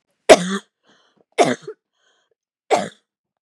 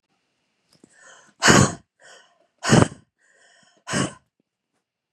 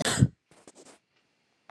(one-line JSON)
{"three_cough_length": "3.4 s", "three_cough_amplitude": 32768, "three_cough_signal_mean_std_ratio": 0.26, "exhalation_length": "5.1 s", "exhalation_amplitude": 32580, "exhalation_signal_mean_std_ratio": 0.27, "cough_length": "1.7 s", "cough_amplitude": 15379, "cough_signal_mean_std_ratio": 0.27, "survey_phase": "beta (2021-08-13 to 2022-03-07)", "age": "45-64", "gender": "Female", "wearing_mask": "No", "symptom_cough_any": true, "symptom_sore_throat": true, "symptom_headache": true, "symptom_onset": "3 days", "smoker_status": "Never smoked", "respiratory_condition_asthma": false, "respiratory_condition_other": false, "recruitment_source": "REACT", "submission_delay": "3 days", "covid_test_result": "Negative", "covid_test_method": "RT-qPCR"}